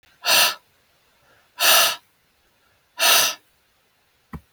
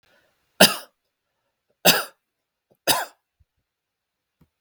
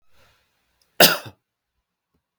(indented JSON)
{
  "exhalation_length": "4.5 s",
  "exhalation_amplitude": 31377,
  "exhalation_signal_mean_std_ratio": 0.38,
  "three_cough_length": "4.6 s",
  "three_cough_amplitude": 32768,
  "three_cough_signal_mean_std_ratio": 0.22,
  "cough_length": "2.4 s",
  "cough_amplitude": 32768,
  "cough_signal_mean_std_ratio": 0.19,
  "survey_phase": "beta (2021-08-13 to 2022-03-07)",
  "age": "45-64",
  "gender": "Male",
  "wearing_mask": "No",
  "symptom_none": true,
  "smoker_status": "Never smoked",
  "respiratory_condition_asthma": false,
  "respiratory_condition_other": false,
  "recruitment_source": "REACT",
  "submission_delay": "2 days",
  "covid_test_result": "Negative",
  "covid_test_method": "RT-qPCR",
  "influenza_a_test_result": "Negative",
  "influenza_b_test_result": "Negative"
}